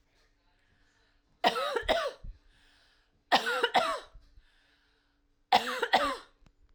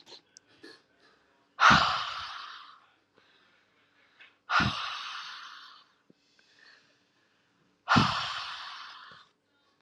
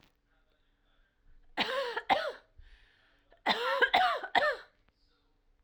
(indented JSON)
{
  "three_cough_length": "6.7 s",
  "three_cough_amplitude": 12317,
  "three_cough_signal_mean_std_ratio": 0.39,
  "exhalation_length": "9.8 s",
  "exhalation_amplitude": 14558,
  "exhalation_signal_mean_std_ratio": 0.32,
  "cough_length": "5.6 s",
  "cough_amplitude": 8467,
  "cough_signal_mean_std_ratio": 0.42,
  "survey_phase": "alpha (2021-03-01 to 2021-08-12)",
  "age": "18-44",
  "gender": "Female",
  "wearing_mask": "No",
  "symptom_fatigue": true,
  "symptom_headache": true,
  "symptom_loss_of_taste": true,
  "smoker_status": "Ex-smoker",
  "respiratory_condition_asthma": false,
  "respiratory_condition_other": false,
  "recruitment_source": "Test and Trace",
  "submission_delay": "2 days",
  "covid_test_result": "Positive",
  "covid_test_method": "RT-qPCR",
  "covid_ct_value": 40.4,
  "covid_ct_gene": "N gene"
}